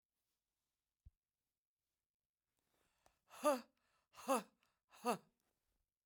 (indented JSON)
{
  "exhalation_length": "6.1 s",
  "exhalation_amplitude": 2120,
  "exhalation_signal_mean_std_ratio": 0.21,
  "survey_phase": "beta (2021-08-13 to 2022-03-07)",
  "age": "65+",
  "gender": "Female",
  "wearing_mask": "No",
  "symptom_none": true,
  "smoker_status": "Never smoked",
  "respiratory_condition_asthma": false,
  "respiratory_condition_other": false,
  "recruitment_source": "REACT",
  "submission_delay": "0 days",
  "covid_test_result": "Negative",
  "covid_test_method": "RT-qPCR"
}